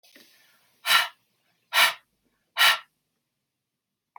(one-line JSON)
{"exhalation_length": "4.2 s", "exhalation_amplitude": 16825, "exhalation_signal_mean_std_ratio": 0.29, "survey_phase": "beta (2021-08-13 to 2022-03-07)", "age": "18-44", "gender": "Female", "wearing_mask": "No", "symptom_none": true, "symptom_onset": "3 days", "smoker_status": "Never smoked", "respiratory_condition_asthma": false, "respiratory_condition_other": false, "recruitment_source": "REACT", "submission_delay": "1 day", "covid_test_result": "Negative", "covid_test_method": "RT-qPCR", "influenza_a_test_result": "Negative", "influenza_b_test_result": "Negative"}